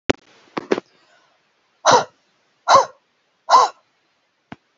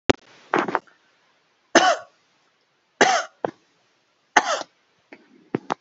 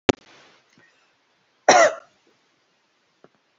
{"exhalation_length": "4.8 s", "exhalation_amplitude": 28903, "exhalation_signal_mean_std_ratio": 0.29, "three_cough_length": "5.8 s", "three_cough_amplitude": 30224, "three_cough_signal_mean_std_ratio": 0.29, "cough_length": "3.6 s", "cough_amplitude": 31483, "cough_signal_mean_std_ratio": 0.22, "survey_phase": "alpha (2021-03-01 to 2021-08-12)", "age": "45-64", "gender": "Female", "wearing_mask": "No", "symptom_none": true, "smoker_status": "Never smoked", "respiratory_condition_asthma": false, "respiratory_condition_other": false, "recruitment_source": "REACT", "submission_delay": "2 days", "covid_test_result": "Negative", "covid_test_method": "RT-qPCR"}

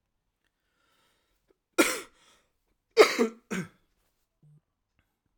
{"cough_length": "5.4 s", "cough_amplitude": 18091, "cough_signal_mean_std_ratio": 0.22, "survey_phase": "alpha (2021-03-01 to 2021-08-12)", "age": "18-44", "gender": "Male", "wearing_mask": "No", "symptom_cough_any": true, "symptom_diarrhoea": true, "symptom_fatigue": true, "symptom_fever_high_temperature": true, "symptom_headache": true, "symptom_onset": "5 days", "smoker_status": "Current smoker (e-cigarettes or vapes only)", "respiratory_condition_asthma": false, "respiratory_condition_other": false, "recruitment_source": "Test and Trace", "submission_delay": "2 days", "covid_test_result": "Positive", "covid_test_method": "RT-qPCR", "covid_ct_value": 11.6, "covid_ct_gene": "N gene", "covid_ct_mean": 11.8, "covid_viral_load": "130000000 copies/ml", "covid_viral_load_category": "High viral load (>1M copies/ml)"}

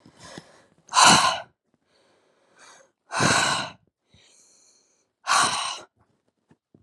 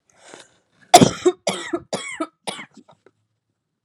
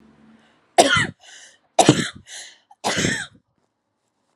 {"exhalation_length": "6.8 s", "exhalation_amplitude": 27048, "exhalation_signal_mean_std_ratio": 0.35, "cough_length": "3.8 s", "cough_amplitude": 32768, "cough_signal_mean_std_ratio": 0.26, "three_cough_length": "4.4 s", "three_cough_amplitude": 32768, "three_cough_signal_mean_std_ratio": 0.34, "survey_phase": "alpha (2021-03-01 to 2021-08-12)", "age": "18-44", "gender": "Female", "wearing_mask": "No", "symptom_shortness_of_breath": true, "symptom_fatigue": true, "symptom_onset": "3 days", "smoker_status": "Never smoked", "respiratory_condition_asthma": false, "respiratory_condition_other": false, "recruitment_source": "Test and Trace", "submission_delay": "2 days", "covid_test_result": "Positive", "covid_test_method": "LAMP"}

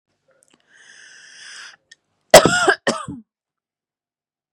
{"cough_length": "4.5 s", "cough_amplitude": 32768, "cough_signal_mean_std_ratio": 0.24, "survey_phase": "beta (2021-08-13 to 2022-03-07)", "age": "18-44", "gender": "Female", "wearing_mask": "No", "symptom_none": true, "smoker_status": "Never smoked", "respiratory_condition_asthma": true, "respiratory_condition_other": false, "recruitment_source": "REACT", "submission_delay": "1 day", "covid_test_result": "Negative", "covid_test_method": "RT-qPCR", "influenza_a_test_result": "Negative", "influenza_b_test_result": "Negative"}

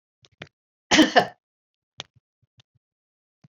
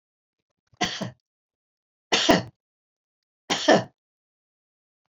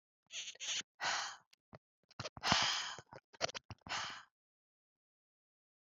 {"cough_length": "3.5 s", "cough_amplitude": 26775, "cough_signal_mean_std_ratio": 0.22, "three_cough_length": "5.1 s", "three_cough_amplitude": 24904, "three_cough_signal_mean_std_ratio": 0.28, "exhalation_length": "5.9 s", "exhalation_amplitude": 7198, "exhalation_signal_mean_std_ratio": 0.4, "survey_phase": "beta (2021-08-13 to 2022-03-07)", "age": "65+", "gender": "Female", "wearing_mask": "No", "symptom_none": true, "smoker_status": "Ex-smoker", "respiratory_condition_asthma": false, "respiratory_condition_other": false, "recruitment_source": "REACT", "submission_delay": "1 day", "covid_test_result": "Negative", "covid_test_method": "RT-qPCR", "influenza_a_test_result": "Negative", "influenza_b_test_result": "Negative"}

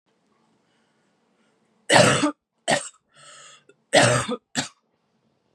{"three_cough_length": "5.5 s", "three_cough_amplitude": 27346, "three_cough_signal_mean_std_ratio": 0.33, "survey_phase": "beta (2021-08-13 to 2022-03-07)", "age": "18-44", "gender": "Female", "wearing_mask": "No", "symptom_cough_any": true, "symptom_new_continuous_cough": true, "symptom_runny_or_blocked_nose": true, "symptom_shortness_of_breath": true, "symptom_sore_throat": true, "symptom_diarrhoea": true, "symptom_fatigue": true, "symptom_headache": true, "symptom_onset": "3 days", "smoker_status": "Never smoked", "respiratory_condition_asthma": false, "respiratory_condition_other": false, "recruitment_source": "Test and Trace", "submission_delay": "2 days", "covid_test_result": "Positive", "covid_test_method": "RT-qPCR", "covid_ct_value": 25.3, "covid_ct_gene": "ORF1ab gene", "covid_ct_mean": 25.5, "covid_viral_load": "4300 copies/ml", "covid_viral_load_category": "Minimal viral load (< 10K copies/ml)"}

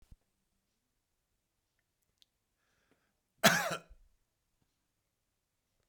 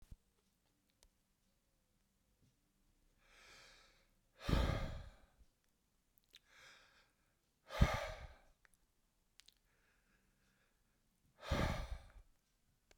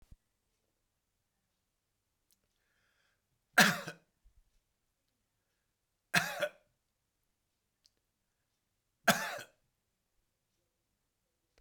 {"cough_length": "5.9 s", "cough_amplitude": 9486, "cough_signal_mean_std_ratio": 0.16, "exhalation_length": "13.0 s", "exhalation_amplitude": 5207, "exhalation_signal_mean_std_ratio": 0.26, "three_cough_length": "11.6 s", "three_cough_amplitude": 11286, "three_cough_signal_mean_std_ratio": 0.17, "survey_phase": "beta (2021-08-13 to 2022-03-07)", "age": "65+", "gender": "Male", "wearing_mask": "No", "symptom_none": true, "smoker_status": "Ex-smoker", "respiratory_condition_asthma": false, "respiratory_condition_other": false, "recruitment_source": "REACT", "submission_delay": "2 days", "covid_test_result": "Negative", "covid_test_method": "RT-qPCR"}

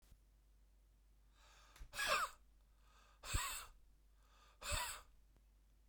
{"exhalation_length": "5.9 s", "exhalation_amplitude": 1856, "exhalation_signal_mean_std_ratio": 0.41, "survey_phase": "beta (2021-08-13 to 2022-03-07)", "age": "65+", "gender": "Male", "wearing_mask": "No", "symptom_cough_any": true, "symptom_runny_or_blocked_nose": true, "symptom_onset": "9 days", "smoker_status": "Ex-smoker", "respiratory_condition_asthma": false, "respiratory_condition_other": true, "recruitment_source": "REACT", "submission_delay": "2 days", "covid_test_result": "Negative", "covid_test_method": "RT-qPCR"}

